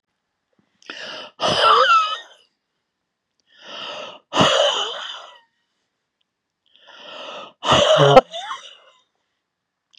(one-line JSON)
{"exhalation_length": "10.0 s", "exhalation_amplitude": 32768, "exhalation_signal_mean_std_ratio": 0.39, "survey_phase": "beta (2021-08-13 to 2022-03-07)", "age": "65+", "gender": "Female", "wearing_mask": "No", "symptom_cough_any": true, "symptom_shortness_of_breath": true, "symptom_onset": "12 days", "smoker_status": "Never smoked", "respiratory_condition_asthma": false, "respiratory_condition_other": true, "recruitment_source": "REACT", "submission_delay": "2 days", "covid_test_result": "Negative", "covid_test_method": "RT-qPCR", "influenza_a_test_result": "Negative", "influenza_b_test_result": "Negative"}